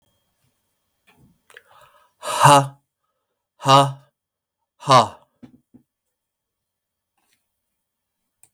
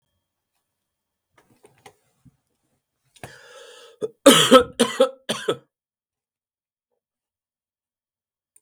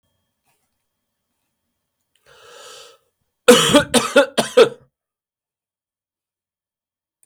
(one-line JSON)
{"exhalation_length": "8.5 s", "exhalation_amplitude": 32768, "exhalation_signal_mean_std_ratio": 0.24, "three_cough_length": "8.6 s", "three_cough_amplitude": 32768, "three_cough_signal_mean_std_ratio": 0.21, "cough_length": "7.3 s", "cough_amplitude": 32768, "cough_signal_mean_std_ratio": 0.25, "survey_phase": "beta (2021-08-13 to 2022-03-07)", "age": "65+", "gender": "Male", "wearing_mask": "No", "symptom_cough_any": true, "symptom_sore_throat": true, "symptom_onset": "4 days", "smoker_status": "Never smoked", "respiratory_condition_asthma": false, "respiratory_condition_other": false, "recruitment_source": "Test and Trace", "submission_delay": "2 days", "covid_test_result": "Positive", "covid_test_method": "RT-qPCR", "covid_ct_value": 21.2, "covid_ct_gene": "N gene"}